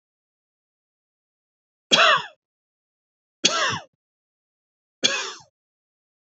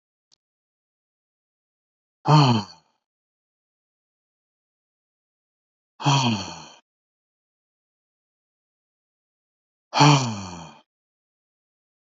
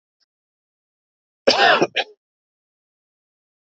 {"three_cough_length": "6.4 s", "three_cough_amplitude": 27004, "three_cough_signal_mean_std_ratio": 0.27, "exhalation_length": "12.0 s", "exhalation_amplitude": 24164, "exhalation_signal_mean_std_ratio": 0.24, "cough_length": "3.8 s", "cough_amplitude": 28649, "cough_signal_mean_std_ratio": 0.26, "survey_phase": "beta (2021-08-13 to 2022-03-07)", "age": "45-64", "gender": "Male", "wearing_mask": "No", "symptom_none": true, "smoker_status": "Never smoked", "respiratory_condition_asthma": false, "respiratory_condition_other": false, "recruitment_source": "REACT", "submission_delay": "3 days", "covid_test_result": "Negative", "covid_test_method": "RT-qPCR", "influenza_a_test_result": "Negative", "influenza_b_test_result": "Negative"}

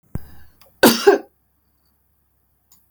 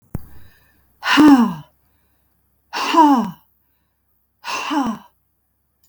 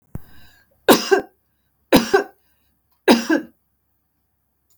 {"cough_length": "2.9 s", "cough_amplitude": 32768, "cough_signal_mean_std_ratio": 0.27, "exhalation_length": "5.9 s", "exhalation_amplitude": 32675, "exhalation_signal_mean_std_ratio": 0.38, "three_cough_length": "4.8 s", "three_cough_amplitude": 32768, "three_cough_signal_mean_std_ratio": 0.31, "survey_phase": "beta (2021-08-13 to 2022-03-07)", "age": "65+", "gender": "Female", "wearing_mask": "No", "symptom_fatigue": true, "symptom_onset": "5 days", "smoker_status": "Ex-smoker", "respiratory_condition_asthma": false, "respiratory_condition_other": false, "recruitment_source": "REACT", "submission_delay": "4 days", "covid_test_result": "Negative", "covid_test_method": "RT-qPCR", "influenza_a_test_result": "Negative", "influenza_b_test_result": "Negative"}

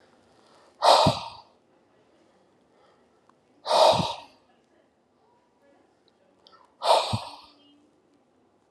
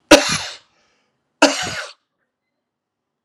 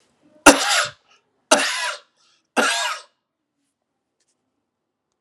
{"exhalation_length": "8.7 s", "exhalation_amplitude": 20782, "exhalation_signal_mean_std_ratio": 0.29, "cough_length": "3.2 s", "cough_amplitude": 32768, "cough_signal_mean_std_ratio": 0.28, "three_cough_length": "5.2 s", "three_cough_amplitude": 32768, "three_cough_signal_mean_std_ratio": 0.31, "survey_phase": "alpha (2021-03-01 to 2021-08-12)", "age": "45-64", "gender": "Male", "wearing_mask": "No", "symptom_none": true, "smoker_status": "Ex-smoker", "respiratory_condition_asthma": false, "respiratory_condition_other": false, "recruitment_source": "Test and Trace", "submission_delay": "0 days", "covid_test_result": "Negative", "covid_test_method": "LFT"}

